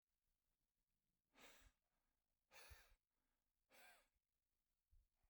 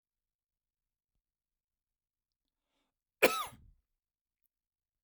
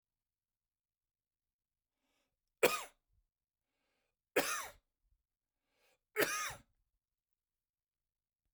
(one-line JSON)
{"exhalation_length": "5.3 s", "exhalation_amplitude": 81, "exhalation_signal_mean_std_ratio": 0.42, "cough_length": "5.0 s", "cough_amplitude": 9368, "cough_signal_mean_std_ratio": 0.14, "three_cough_length": "8.5 s", "three_cough_amplitude": 6209, "three_cough_signal_mean_std_ratio": 0.21, "survey_phase": "beta (2021-08-13 to 2022-03-07)", "age": "45-64", "gender": "Male", "wearing_mask": "Yes", "symptom_cough_any": true, "symptom_runny_or_blocked_nose": true, "symptom_fatigue": true, "symptom_headache": true, "symptom_onset": "12 days", "smoker_status": "Never smoked", "respiratory_condition_asthma": false, "respiratory_condition_other": false, "recruitment_source": "REACT", "submission_delay": "1 day", "covid_test_result": "Negative", "covid_test_method": "RT-qPCR", "influenza_a_test_result": "Negative", "influenza_b_test_result": "Negative"}